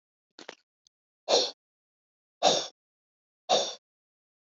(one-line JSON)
{"exhalation_length": "4.4 s", "exhalation_amplitude": 13416, "exhalation_signal_mean_std_ratio": 0.29, "survey_phase": "beta (2021-08-13 to 2022-03-07)", "age": "65+", "gender": "Female", "wearing_mask": "No", "symptom_none": true, "smoker_status": "Ex-smoker", "respiratory_condition_asthma": false, "respiratory_condition_other": false, "recruitment_source": "REACT", "submission_delay": "1 day", "covid_test_result": "Negative", "covid_test_method": "RT-qPCR", "influenza_a_test_result": "Negative", "influenza_b_test_result": "Negative"}